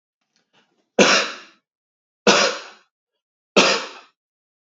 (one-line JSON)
{"three_cough_length": "4.6 s", "three_cough_amplitude": 28623, "three_cough_signal_mean_std_ratio": 0.34, "survey_phase": "beta (2021-08-13 to 2022-03-07)", "age": "18-44", "gender": "Male", "wearing_mask": "No", "symptom_none": true, "smoker_status": "Never smoked", "respiratory_condition_asthma": false, "respiratory_condition_other": false, "recruitment_source": "REACT", "submission_delay": "2 days", "covid_test_result": "Negative", "covid_test_method": "RT-qPCR", "influenza_a_test_result": "Negative", "influenza_b_test_result": "Negative"}